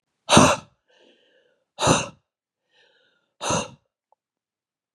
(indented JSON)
{
  "exhalation_length": "4.9 s",
  "exhalation_amplitude": 29019,
  "exhalation_signal_mean_std_ratio": 0.28,
  "survey_phase": "beta (2021-08-13 to 2022-03-07)",
  "age": "45-64",
  "gender": "Female",
  "wearing_mask": "No",
  "symptom_cough_any": true,
  "symptom_runny_or_blocked_nose": true,
  "symptom_fatigue": true,
  "symptom_change_to_sense_of_smell_or_taste": true,
  "symptom_loss_of_taste": true,
  "symptom_onset": "2 days",
  "smoker_status": "Never smoked",
  "respiratory_condition_asthma": false,
  "respiratory_condition_other": false,
  "recruitment_source": "Test and Trace",
  "submission_delay": "1 day",
  "covid_test_result": "Positive",
  "covid_test_method": "RT-qPCR"
}